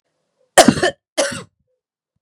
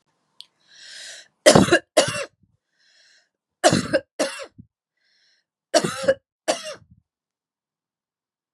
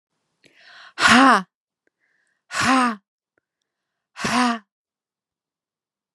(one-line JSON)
{"cough_length": "2.2 s", "cough_amplitude": 32768, "cough_signal_mean_std_ratio": 0.3, "three_cough_length": "8.5 s", "three_cough_amplitude": 32768, "three_cough_signal_mean_std_ratio": 0.29, "exhalation_length": "6.1 s", "exhalation_amplitude": 29780, "exhalation_signal_mean_std_ratio": 0.33, "survey_phase": "beta (2021-08-13 to 2022-03-07)", "age": "45-64", "gender": "Female", "wearing_mask": "No", "symptom_cough_any": true, "symptom_runny_or_blocked_nose": true, "symptom_headache": true, "smoker_status": "Never smoked", "respiratory_condition_asthma": false, "respiratory_condition_other": false, "recruitment_source": "Test and Trace", "submission_delay": "2 days", "covid_test_result": "Positive", "covid_test_method": "RT-qPCR", "covid_ct_value": 21.8, "covid_ct_gene": "N gene", "covid_ct_mean": 21.9, "covid_viral_load": "66000 copies/ml", "covid_viral_load_category": "Low viral load (10K-1M copies/ml)"}